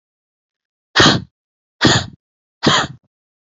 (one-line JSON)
{"exhalation_length": "3.6 s", "exhalation_amplitude": 30930, "exhalation_signal_mean_std_ratio": 0.35, "survey_phase": "alpha (2021-03-01 to 2021-08-12)", "age": "45-64", "gender": "Female", "wearing_mask": "No", "symptom_none": true, "smoker_status": "Never smoked", "respiratory_condition_asthma": true, "respiratory_condition_other": true, "recruitment_source": "REACT", "submission_delay": "9 days", "covid_test_result": "Negative", "covid_test_method": "RT-qPCR"}